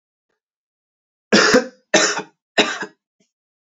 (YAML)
three_cough_length: 3.8 s
three_cough_amplitude: 29901
three_cough_signal_mean_std_ratio: 0.35
survey_phase: beta (2021-08-13 to 2022-03-07)
age: 18-44
gender: Male
wearing_mask: 'No'
symptom_runny_or_blocked_nose: true
symptom_headache: true
symptom_change_to_sense_of_smell_or_taste: true
symptom_onset: 3 days
smoker_status: Never smoked
respiratory_condition_asthma: false
respiratory_condition_other: false
recruitment_source: Test and Trace
submission_delay: 2 days
covid_test_result: Positive
covid_test_method: RT-qPCR